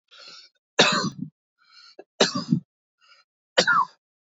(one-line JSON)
{"three_cough_length": "4.3 s", "three_cough_amplitude": 23046, "three_cough_signal_mean_std_ratio": 0.36, "survey_phase": "beta (2021-08-13 to 2022-03-07)", "age": "45-64", "gender": "Male", "wearing_mask": "No", "symptom_runny_or_blocked_nose": true, "symptom_shortness_of_breath": true, "symptom_abdominal_pain": true, "symptom_headache": true, "symptom_onset": "12 days", "smoker_status": "Ex-smoker", "respiratory_condition_asthma": false, "respiratory_condition_other": false, "recruitment_source": "REACT", "submission_delay": "3 days", "covid_test_result": "Negative", "covid_test_method": "RT-qPCR", "influenza_a_test_result": "Negative", "influenza_b_test_result": "Negative"}